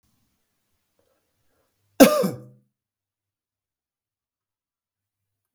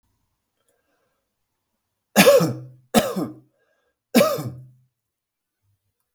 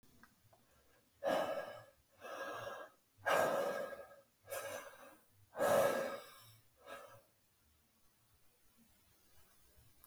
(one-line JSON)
{"cough_length": "5.5 s", "cough_amplitude": 32768, "cough_signal_mean_std_ratio": 0.16, "three_cough_length": "6.1 s", "three_cough_amplitude": 32768, "three_cough_signal_mean_std_ratio": 0.3, "exhalation_length": "10.1 s", "exhalation_amplitude": 3010, "exhalation_signal_mean_std_ratio": 0.42, "survey_phase": "beta (2021-08-13 to 2022-03-07)", "age": "45-64", "gender": "Male", "wearing_mask": "No", "symptom_none": true, "smoker_status": "Never smoked", "respiratory_condition_asthma": false, "respiratory_condition_other": false, "recruitment_source": "REACT", "submission_delay": "2 days", "covid_test_result": "Negative", "covid_test_method": "RT-qPCR", "influenza_a_test_result": "Unknown/Void", "influenza_b_test_result": "Unknown/Void"}